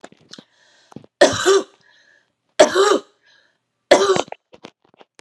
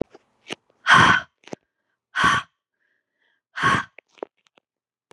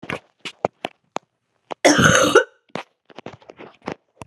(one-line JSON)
{"three_cough_length": "5.2 s", "three_cough_amplitude": 32768, "three_cough_signal_mean_std_ratio": 0.35, "exhalation_length": "5.1 s", "exhalation_amplitude": 26168, "exhalation_signal_mean_std_ratio": 0.32, "cough_length": "4.3 s", "cough_amplitude": 32715, "cough_signal_mean_std_ratio": 0.33, "survey_phase": "beta (2021-08-13 to 2022-03-07)", "age": "45-64", "gender": "Male", "wearing_mask": "No", "symptom_cough_any": true, "symptom_runny_or_blocked_nose": true, "symptom_diarrhoea": true, "symptom_fatigue": true, "symptom_other": true, "symptom_onset": "4 days", "smoker_status": "Ex-smoker", "respiratory_condition_asthma": false, "respiratory_condition_other": false, "recruitment_source": "Test and Trace", "submission_delay": "2 days", "covid_test_result": "Positive", "covid_test_method": "RT-qPCR", "covid_ct_value": 20.5, "covid_ct_gene": "ORF1ab gene", "covid_ct_mean": 21.5, "covid_viral_load": "89000 copies/ml", "covid_viral_load_category": "Low viral load (10K-1M copies/ml)"}